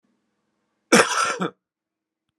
{
  "cough_length": "2.4 s",
  "cough_amplitude": 32767,
  "cough_signal_mean_std_ratio": 0.32,
  "survey_phase": "alpha (2021-03-01 to 2021-08-12)",
  "age": "45-64",
  "gender": "Male",
  "wearing_mask": "No",
  "symptom_none": true,
  "symptom_onset": "4 days",
  "smoker_status": "Never smoked",
  "respiratory_condition_asthma": true,
  "respiratory_condition_other": false,
  "recruitment_source": "REACT",
  "submission_delay": "1 day",
  "covid_test_result": "Negative",
  "covid_test_method": "RT-qPCR"
}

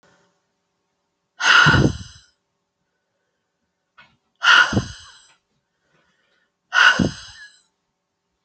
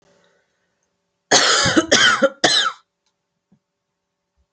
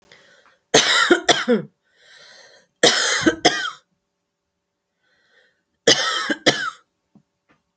{
  "exhalation_length": "8.4 s",
  "exhalation_amplitude": 31451,
  "exhalation_signal_mean_std_ratio": 0.31,
  "cough_length": "4.5 s",
  "cough_amplitude": 32234,
  "cough_signal_mean_std_ratio": 0.41,
  "three_cough_length": "7.8 s",
  "three_cough_amplitude": 32767,
  "three_cough_signal_mean_std_ratio": 0.39,
  "survey_phase": "alpha (2021-03-01 to 2021-08-12)",
  "age": "18-44",
  "gender": "Female",
  "wearing_mask": "No",
  "symptom_none": true,
  "smoker_status": "Never smoked",
  "respiratory_condition_asthma": false,
  "respiratory_condition_other": false,
  "recruitment_source": "REACT",
  "submission_delay": "5 days",
  "covid_test_result": "Negative",
  "covid_test_method": "RT-qPCR"
}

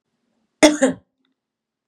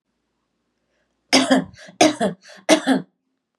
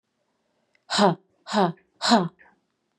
{
  "cough_length": "1.9 s",
  "cough_amplitude": 32767,
  "cough_signal_mean_std_ratio": 0.26,
  "three_cough_length": "3.6 s",
  "three_cough_amplitude": 30580,
  "three_cough_signal_mean_std_ratio": 0.37,
  "exhalation_length": "3.0 s",
  "exhalation_amplitude": 21975,
  "exhalation_signal_mean_std_ratio": 0.36,
  "survey_phase": "beta (2021-08-13 to 2022-03-07)",
  "age": "18-44",
  "gender": "Female",
  "wearing_mask": "No",
  "symptom_cough_any": true,
  "symptom_headache": true,
  "smoker_status": "Current smoker (1 to 10 cigarettes per day)",
  "respiratory_condition_asthma": false,
  "respiratory_condition_other": false,
  "recruitment_source": "Test and Trace",
  "submission_delay": "0 days",
  "covid_test_result": "Positive",
  "covid_test_method": "LFT"
}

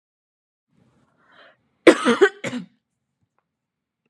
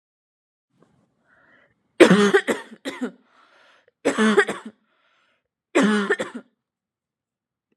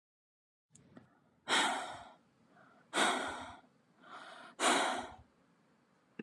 {
  "cough_length": "4.1 s",
  "cough_amplitude": 32767,
  "cough_signal_mean_std_ratio": 0.22,
  "three_cough_length": "7.8 s",
  "three_cough_amplitude": 32767,
  "three_cough_signal_mean_std_ratio": 0.33,
  "exhalation_length": "6.2 s",
  "exhalation_amplitude": 4352,
  "exhalation_signal_mean_std_ratio": 0.41,
  "survey_phase": "beta (2021-08-13 to 2022-03-07)",
  "age": "18-44",
  "gender": "Female",
  "wearing_mask": "No",
  "symptom_cough_any": true,
  "symptom_onset": "10 days",
  "smoker_status": "Never smoked",
  "respiratory_condition_asthma": true,
  "respiratory_condition_other": false,
  "recruitment_source": "REACT",
  "submission_delay": "2 days",
  "covid_test_result": "Negative",
  "covid_test_method": "RT-qPCR",
  "influenza_a_test_result": "Negative",
  "influenza_b_test_result": "Negative"
}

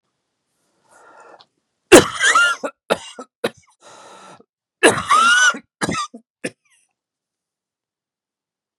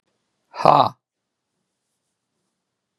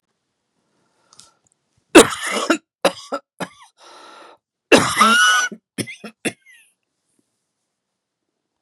{
  "three_cough_length": "8.8 s",
  "three_cough_amplitude": 32768,
  "three_cough_signal_mean_std_ratio": 0.32,
  "exhalation_length": "3.0 s",
  "exhalation_amplitude": 32768,
  "exhalation_signal_mean_std_ratio": 0.2,
  "cough_length": "8.6 s",
  "cough_amplitude": 32768,
  "cough_signal_mean_std_ratio": 0.3,
  "survey_phase": "beta (2021-08-13 to 2022-03-07)",
  "age": "65+",
  "gender": "Male",
  "wearing_mask": "No",
  "symptom_none": true,
  "smoker_status": "Never smoked",
  "respiratory_condition_asthma": false,
  "respiratory_condition_other": false,
  "recruitment_source": "REACT",
  "submission_delay": "1 day",
  "covid_test_result": "Negative",
  "covid_test_method": "RT-qPCR",
  "influenza_a_test_result": "Unknown/Void",
  "influenza_b_test_result": "Unknown/Void"
}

